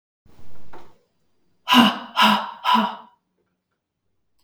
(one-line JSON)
{"exhalation_length": "4.4 s", "exhalation_amplitude": 32264, "exhalation_signal_mean_std_ratio": 0.43, "survey_phase": "beta (2021-08-13 to 2022-03-07)", "age": "18-44", "gender": "Female", "wearing_mask": "No", "symptom_none": true, "smoker_status": "Never smoked", "respiratory_condition_asthma": false, "respiratory_condition_other": false, "recruitment_source": "REACT", "submission_delay": "1 day", "covid_test_result": "Negative", "covid_test_method": "RT-qPCR", "influenza_a_test_result": "Unknown/Void", "influenza_b_test_result": "Unknown/Void"}